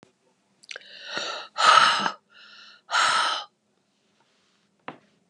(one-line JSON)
{"exhalation_length": "5.3 s", "exhalation_amplitude": 26660, "exhalation_signal_mean_std_ratio": 0.38, "survey_phase": "beta (2021-08-13 to 2022-03-07)", "age": "65+", "gender": "Male", "wearing_mask": "No", "symptom_fatigue": true, "smoker_status": "Never smoked", "respiratory_condition_asthma": false, "respiratory_condition_other": false, "recruitment_source": "Test and Trace", "submission_delay": "1 day", "covid_test_result": "Positive", "covid_test_method": "RT-qPCR", "covid_ct_value": 19.6, "covid_ct_gene": "ORF1ab gene", "covid_ct_mean": 20.2, "covid_viral_load": "240000 copies/ml", "covid_viral_load_category": "Low viral load (10K-1M copies/ml)"}